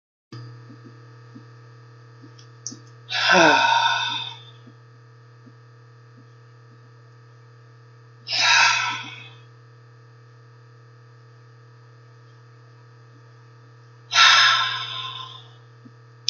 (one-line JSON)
{"exhalation_length": "16.3 s", "exhalation_amplitude": 27648, "exhalation_signal_mean_std_ratio": 0.37, "survey_phase": "beta (2021-08-13 to 2022-03-07)", "age": "45-64", "gender": "Female", "wearing_mask": "No", "symptom_none": true, "symptom_onset": "10 days", "smoker_status": "Ex-smoker", "respiratory_condition_asthma": false, "respiratory_condition_other": false, "recruitment_source": "REACT", "submission_delay": "0 days", "covid_test_result": "Negative", "covid_test_method": "RT-qPCR", "influenza_a_test_result": "Negative", "influenza_b_test_result": "Negative"}